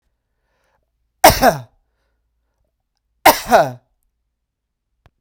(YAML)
cough_length: 5.2 s
cough_amplitude: 32768
cough_signal_mean_std_ratio: 0.25
survey_phase: beta (2021-08-13 to 2022-03-07)
age: 45-64
gender: Male
wearing_mask: 'No'
symptom_none: true
smoker_status: Never smoked
respiratory_condition_asthma: false
respiratory_condition_other: false
recruitment_source: REACT
submission_delay: 1 day
covid_test_result: Negative
covid_test_method: RT-qPCR
influenza_a_test_result: Negative
influenza_b_test_result: Negative